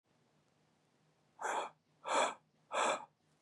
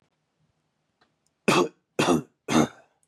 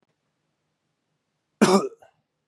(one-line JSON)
{"exhalation_length": "3.4 s", "exhalation_amplitude": 2911, "exhalation_signal_mean_std_ratio": 0.4, "three_cough_length": "3.1 s", "three_cough_amplitude": 14702, "three_cough_signal_mean_std_ratio": 0.35, "cough_length": "2.5 s", "cough_amplitude": 23440, "cough_signal_mean_std_ratio": 0.25, "survey_phase": "beta (2021-08-13 to 2022-03-07)", "age": "18-44", "gender": "Male", "wearing_mask": "No", "symptom_none": true, "smoker_status": "Prefer not to say", "respiratory_condition_asthma": false, "respiratory_condition_other": false, "recruitment_source": "REACT", "submission_delay": "5 days", "covid_test_result": "Negative", "covid_test_method": "RT-qPCR", "influenza_a_test_result": "Negative", "influenza_b_test_result": "Negative"}